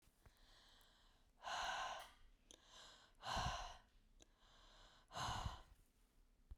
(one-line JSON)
{"exhalation_length": "6.6 s", "exhalation_amplitude": 770, "exhalation_signal_mean_std_ratio": 0.5, "survey_phase": "beta (2021-08-13 to 2022-03-07)", "age": "45-64", "gender": "Female", "wearing_mask": "No", "symptom_cough_any": true, "symptom_runny_or_blocked_nose": true, "symptom_sore_throat": true, "symptom_diarrhoea": true, "symptom_fatigue": true, "symptom_fever_high_temperature": true, "symptom_headache": true, "symptom_other": true, "symptom_onset": "1 day", "smoker_status": "Never smoked", "respiratory_condition_asthma": false, "respiratory_condition_other": false, "recruitment_source": "Test and Trace", "submission_delay": "1 day", "covid_test_result": "Positive", "covid_test_method": "RT-qPCR", "covid_ct_value": 23.9, "covid_ct_gene": "ORF1ab gene"}